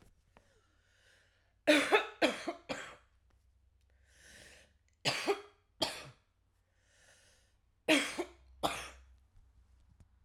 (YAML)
three_cough_length: 10.2 s
three_cough_amplitude: 7539
three_cough_signal_mean_std_ratio: 0.31
survey_phase: alpha (2021-03-01 to 2021-08-12)
age: 45-64
gender: Female
wearing_mask: 'No'
symptom_none: true
smoker_status: Current smoker (11 or more cigarettes per day)
respiratory_condition_asthma: false
respiratory_condition_other: false
recruitment_source: REACT
submission_delay: 1 day
covid_test_result: Negative
covid_test_method: RT-qPCR